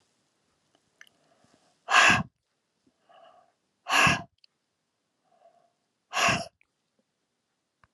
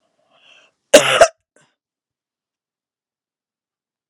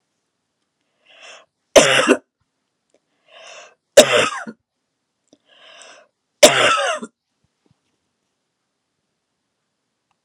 {
  "exhalation_length": "7.9 s",
  "exhalation_amplitude": 20084,
  "exhalation_signal_mean_std_ratio": 0.26,
  "cough_length": "4.1 s",
  "cough_amplitude": 32768,
  "cough_signal_mean_std_ratio": 0.2,
  "three_cough_length": "10.2 s",
  "three_cough_amplitude": 32768,
  "three_cough_signal_mean_std_ratio": 0.26,
  "survey_phase": "alpha (2021-03-01 to 2021-08-12)",
  "age": "45-64",
  "gender": "Female",
  "wearing_mask": "No",
  "symptom_fatigue": true,
  "symptom_onset": "3 days",
  "smoker_status": "Never smoked",
  "respiratory_condition_asthma": false,
  "respiratory_condition_other": false,
  "recruitment_source": "Test and Trace",
  "submission_delay": "2 days",
  "covid_test_result": "Positive",
  "covid_test_method": "RT-qPCR"
}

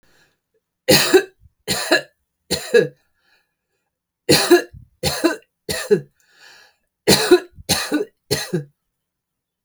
{
  "three_cough_length": "9.6 s",
  "three_cough_amplitude": 32768,
  "three_cough_signal_mean_std_ratio": 0.38,
  "survey_phase": "alpha (2021-03-01 to 2021-08-12)",
  "age": "45-64",
  "gender": "Female",
  "wearing_mask": "No",
  "symptom_none": true,
  "smoker_status": "Current smoker (1 to 10 cigarettes per day)",
  "respiratory_condition_asthma": false,
  "respiratory_condition_other": false,
  "recruitment_source": "REACT",
  "submission_delay": "2 days",
  "covid_test_result": "Negative",
  "covid_test_method": "RT-qPCR"
}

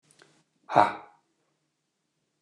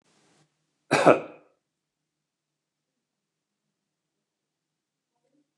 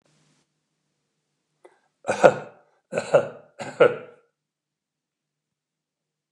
{
  "exhalation_length": "2.4 s",
  "exhalation_amplitude": 24985,
  "exhalation_signal_mean_std_ratio": 0.2,
  "cough_length": "5.6 s",
  "cough_amplitude": 24747,
  "cough_signal_mean_std_ratio": 0.16,
  "three_cough_length": "6.3 s",
  "three_cough_amplitude": 29204,
  "three_cough_signal_mean_std_ratio": 0.22,
  "survey_phase": "beta (2021-08-13 to 2022-03-07)",
  "age": "65+",
  "gender": "Male",
  "wearing_mask": "No",
  "symptom_none": true,
  "smoker_status": "Never smoked",
  "respiratory_condition_asthma": false,
  "respiratory_condition_other": false,
  "recruitment_source": "REACT",
  "submission_delay": "1 day",
  "covid_test_result": "Negative",
  "covid_test_method": "RT-qPCR",
  "influenza_a_test_result": "Negative",
  "influenza_b_test_result": "Negative"
}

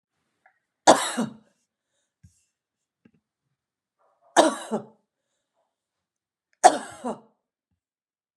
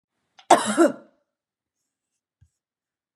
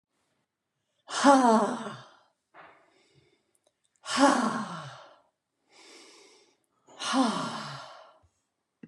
{
  "three_cough_length": "8.4 s",
  "three_cough_amplitude": 30968,
  "three_cough_signal_mean_std_ratio": 0.2,
  "cough_length": "3.2 s",
  "cough_amplitude": 29376,
  "cough_signal_mean_std_ratio": 0.24,
  "exhalation_length": "8.9 s",
  "exhalation_amplitude": 17799,
  "exhalation_signal_mean_std_ratio": 0.35,
  "survey_phase": "beta (2021-08-13 to 2022-03-07)",
  "age": "65+",
  "gender": "Female",
  "wearing_mask": "No",
  "symptom_none": true,
  "smoker_status": "Never smoked",
  "respiratory_condition_asthma": false,
  "respiratory_condition_other": false,
  "recruitment_source": "REACT",
  "submission_delay": "1 day",
  "covid_test_result": "Negative",
  "covid_test_method": "RT-qPCR"
}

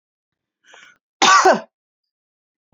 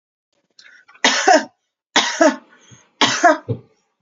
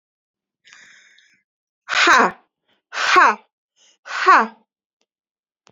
{
  "cough_length": "2.7 s",
  "cough_amplitude": 29130,
  "cough_signal_mean_std_ratio": 0.3,
  "three_cough_length": "4.0 s",
  "three_cough_amplitude": 32768,
  "three_cough_signal_mean_std_ratio": 0.41,
  "exhalation_length": "5.7 s",
  "exhalation_amplitude": 28999,
  "exhalation_signal_mean_std_ratio": 0.34,
  "survey_phase": "beta (2021-08-13 to 2022-03-07)",
  "age": "18-44",
  "gender": "Female",
  "wearing_mask": "No",
  "symptom_sore_throat": true,
  "symptom_onset": "12 days",
  "smoker_status": "Current smoker (1 to 10 cigarettes per day)",
  "respiratory_condition_asthma": false,
  "respiratory_condition_other": false,
  "recruitment_source": "REACT",
  "submission_delay": "1 day",
  "covid_test_result": "Negative",
  "covid_test_method": "RT-qPCR",
  "influenza_a_test_result": "Negative",
  "influenza_b_test_result": "Negative"
}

